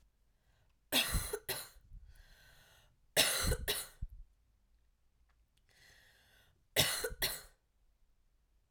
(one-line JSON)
{"three_cough_length": "8.7 s", "three_cough_amplitude": 5795, "three_cough_signal_mean_std_ratio": 0.37, "survey_phase": "alpha (2021-03-01 to 2021-08-12)", "age": "18-44", "gender": "Female", "wearing_mask": "No", "symptom_cough_any": true, "symptom_headache": true, "symptom_onset": "4 days", "smoker_status": "Never smoked", "respiratory_condition_asthma": false, "respiratory_condition_other": false, "recruitment_source": "Test and Trace", "submission_delay": "2 days", "covid_test_result": "Positive", "covid_test_method": "RT-qPCR", "covid_ct_value": 23.9, "covid_ct_gene": "ORF1ab gene", "covid_ct_mean": 24.5, "covid_viral_load": "9300 copies/ml", "covid_viral_load_category": "Minimal viral load (< 10K copies/ml)"}